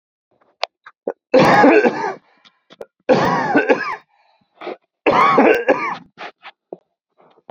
{
  "three_cough_length": "7.5 s",
  "three_cough_amplitude": 28222,
  "three_cough_signal_mean_std_ratio": 0.47,
  "survey_phase": "beta (2021-08-13 to 2022-03-07)",
  "age": "18-44",
  "gender": "Male",
  "wearing_mask": "No",
  "symptom_cough_any": true,
  "smoker_status": "Ex-smoker",
  "respiratory_condition_asthma": false,
  "respiratory_condition_other": false,
  "recruitment_source": "REACT",
  "submission_delay": "2 days",
  "covid_test_result": "Negative",
  "covid_test_method": "RT-qPCR",
  "influenza_a_test_result": "Unknown/Void",
  "influenza_b_test_result": "Unknown/Void"
}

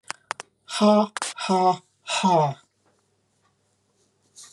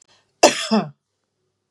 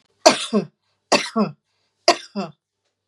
{
  "exhalation_length": "4.5 s",
  "exhalation_amplitude": 16376,
  "exhalation_signal_mean_std_ratio": 0.42,
  "cough_length": "1.7 s",
  "cough_amplitude": 32768,
  "cough_signal_mean_std_ratio": 0.31,
  "three_cough_length": "3.1 s",
  "three_cough_amplitude": 32768,
  "three_cough_signal_mean_std_ratio": 0.34,
  "survey_phase": "beta (2021-08-13 to 2022-03-07)",
  "age": "45-64",
  "gender": "Female",
  "wearing_mask": "No",
  "symptom_none": true,
  "smoker_status": "Never smoked",
  "respiratory_condition_asthma": true,
  "respiratory_condition_other": false,
  "recruitment_source": "REACT",
  "submission_delay": "11 days",
  "covid_test_result": "Negative",
  "covid_test_method": "RT-qPCR",
  "influenza_a_test_result": "Negative",
  "influenza_b_test_result": "Negative"
}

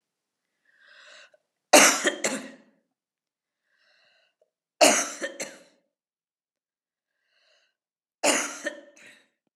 {
  "three_cough_length": "9.6 s",
  "three_cough_amplitude": 29910,
  "three_cough_signal_mean_std_ratio": 0.25,
  "survey_phase": "beta (2021-08-13 to 2022-03-07)",
  "age": "45-64",
  "gender": "Female",
  "wearing_mask": "No",
  "symptom_runny_or_blocked_nose": true,
  "symptom_sore_throat": true,
  "symptom_fatigue": true,
  "symptom_headache": true,
  "symptom_change_to_sense_of_smell_or_taste": true,
  "symptom_loss_of_taste": true,
  "symptom_onset": "5 days",
  "smoker_status": "Ex-smoker",
  "respiratory_condition_asthma": false,
  "respiratory_condition_other": false,
  "recruitment_source": "Test and Trace",
  "submission_delay": "2 days",
  "covid_test_result": "Positive",
  "covid_test_method": "RT-qPCR",
  "covid_ct_value": 14.0,
  "covid_ct_gene": "N gene"
}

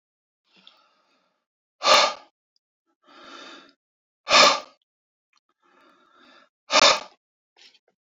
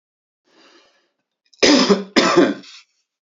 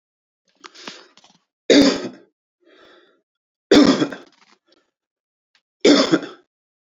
{
  "exhalation_length": "8.1 s",
  "exhalation_amplitude": 25855,
  "exhalation_signal_mean_std_ratio": 0.26,
  "cough_length": "3.3 s",
  "cough_amplitude": 31401,
  "cough_signal_mean_std_ratio": 0.39,
  "three_cough_length": "6.8 s",
  "three_cough_amplitude": 31332,
  "three_cough_signal_mean_std_ratio": 0.31,
  "survey_phase": "beta (2021-08-13 to 2022-03-07)",
  "age": "45-64",
  "gender": "Male",
  "wearing_mask": "No",
  "symptom_none": true,
  "smoker_status": "Ex-smoker",
  "respiratory_condition_asthma": false,
  "respiratory_condition_other": false,
  "recruitment_source": "Test and Trace",
  "submission_delay": "2 days",
  "covid_test_result": "Positive",
  "covid_test_method": "RT-qPCR",
  "covid_ct_value": 24.0,
  "covid_ct_gene": "ORF1ab gene"
}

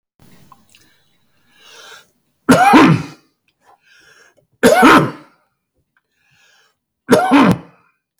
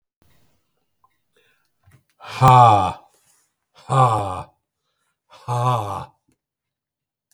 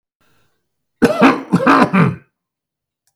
{
  "three_cough_length": "8.2 s",
  "three_cough_amplitude": 32768,
  "three_cough_signal_mean_std_ratio": 0.36,
  "exhalation_length": "7.3 s",
  "exhalation_amplitude": 32768,
  "exhalation_signal_mean_std_ratio": 0.32,
  "cough_length": "3.2 s",
  "cough_amplitude": 32768,
  "cough_signal_mean_std_ratio": 0.44,
  "survey_phase": "beta (2021-08-13 to 2022-03-07)",
  "age": "65+",
  "gender": "Male",
  "wearing_mask": "No",
  "symptom_none": true,
  "smoker_status": "Ex-smoker",
  "respiratory_condition_asthma": true,
  "respiratory_condition_other": false,
  "recruitment_source": "REACT",
  "submission_delay": "6 days",
  "covid_test_result": "Negative",
  "covid_test_method": "RT-qPCR",
  "influenza_a_test_result": "Negative",
  "influenza_b_test_result": "Negative"
}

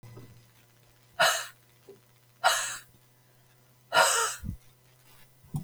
{
  "exhalation_length": "5.6 s",
  "exhalation_amplitude": 13024,
  "exhalation_signal_mean_std_ratio": 0.37,
  "survey_phase": "beta (2021-08-13 to 2022-03-07)",
  "age": "45-64",
  "gender": "Female",
  "wearing_mask": "No",
  "symptom_cough_any": true,
  "symptom_new_continuous_cough": true,
  "symptom_runny_or_blocked_nose": true,
  "symptom_sore_throat": true,
  "symptom_fatigue": true,
  "symptom_fever_high_temperature": true,
  "symptom_headache": true,
  "symptom_onset": "2 days",
  "smoker_status": "Ex-smoker",
  "respiratory_condition_asthma": false,
  "respiratory_condition_other": false,
  "recruitment_source": "Test and Trace",
  "submission_delay": "1 day",
  "covid_test_result": "Positive",
  "covid_test_method": "RT-qPCR",
  "covid_ct_value": 19.0,
  "covid_ct_gene": "N gene",
  "covid_ct_mean": 19.3,
  "covid_viral_load": "460000 copies/ml",
  "covid_viral_load_category": "Low viral load (10K-1M copies/ml)"
}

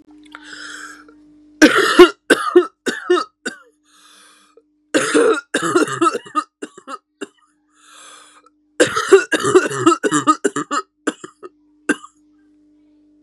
{
  "three_cough_length": "13.2 s",
  "three_cough_amplitude": 32768,
  "three_cough_signal_mean_std_ratio": 0.39,
  "survey_phase": "beta (2021-08-13 to 2022-03-07)",
  "age": "18-44",
  "gender": "Female",
  "wearing_mask": "No",
  "symptom_cough_any": true,
  "symptom_runny_or_blocked_nose": true,
  "symptom_sore_throat": true,
  "symptom_abdominal_pain": true,
  "symptom_diarrhoea": true,
  "symptom_fatigue": true,
  "symptom_headache": true,
  "smoker_status": "Ex-smoker",
  "respiratory_condition_asthma": true,
  "respiratory_condition_other": false,
  "recruitment_source": "Test and Trace",
  "submission_delay": "1 day",
  "covid_test_result": "Positive",
  "covid_test_method": "RT-qPCR",
  "covid_ct_value": 15.2,
  "covid_ct_gene": "ORF1ab gene"
}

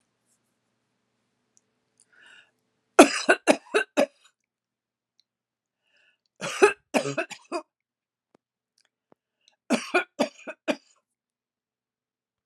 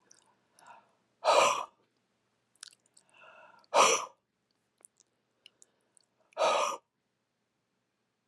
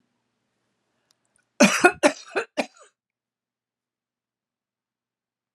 {
  "three_cough_length": "12.5 s",
  "three_cough_amplitude": 32767,
  "three_cough_signal_mean_std_ratio": 0.22,
  "exhalation_length": "8.3 s",
  "exhalation_amplitude": 10535,
  "exhalation_signal_mean_std_ratio": 0.28,
  "cough_length": "5.5 s",
  "cough_amplitude": 32595,
  "cough_signal_mean_std_ratio": 0.21,
  "survey_phase": "alpha (2021-03-01 to 2021-08-12)",
  "age": "65+",
  "gender": "Female",
  "wearing_mask": "No",
  "symptom_none": true,
  "smoker_status": "Never smoked",
  "respiratory_condition_asthma": false,
  "respiratory_condition_other": false,
  "recruitment_source": "REACT",
  "submission_delay": "1 day",
  "covid_test_result": "Negative",
  "covid_test_method": "RT-qPCR"
}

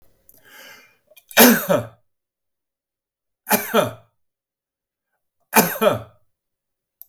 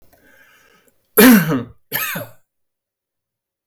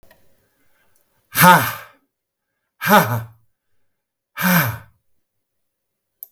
{
  "three_cough_length": "7.1 s",
  "three_cough_amplitude": 32768,
  "three_cough_signal_mean_std_ratio": 0.29,
  "cough_length": "3.7 s",
  "cough_amplitude": 32768,
  "cough_signal_mean_std_ratio": 0.32,
  "exhalation_length": "6.3 s",
  "exhalation_amplitude": 32768,
  "exhalation_signal_mean_std_ratio": 0.31,
  "survey_phase": "beta (2021-08-13 to 2022-03-07)",
  "age": "65+",
  "gender": "Male",
  "wearing_mask": "No",
  "symptom_none": true,
  "smoker_status": "Ex-smoker",
  "respiratory_condition_asthma": false,
  "respiratory_condition_other": false,
  "recruitment_source": "REACT",
  "submission_delay": "3 days",
  "covid_test_result": "Negative",
  "covid_test_method": "RT-qPCR",
  "influenza_a_test_result": "Negative",
  "influenza_b_test_result": "Negative"
}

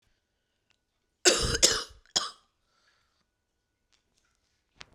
{
  "cough_length": "4.9 s",
  "cough_amplitude": 20151,
  "cough_signal_mean_std_ratio": 0.25,
  "survey_phase": "beta (2021-08-13 to 2022-03-07)",
  "age": "45-64",
  "gender": "Female",
  "wearing_mask": "No",
  "symptom_cough_any": true,
  "symptom_new_continuous_cough": true,
  "symptom_runny_or_blocked_nose": true,
  "symptom_shortness_of_breath": true,
  "symptom_sore_throat": true,
  "symptom_fatigue": true,
  "symptom_fever_high_temperature": true,
  "symptom_headache": true,
  "symptom_change_to_sense_of_smell_or_taste": true,
  "symptom_onset": "4 days",
  "smoker_status": "Never smoked",
  "respiratory_condition_asthma": true,
  "respiratory_condition_other": false,
  "recruitment_source": "Test and Trace",
  "submission_delay": "1 day",
  "covid_test_result": "Positive",
  "covid_test_method": "RT-qPCR",
  "covid_ct_value": 14.0,
  "covid_ct_gene": "ORF1ab gene",
  "covid_ct_mean": 14.3,
  "covid_viral_load": "20000000 copies/ml",
  "covid_viral_load_category": "High viral load (>1M copies/ml)"
}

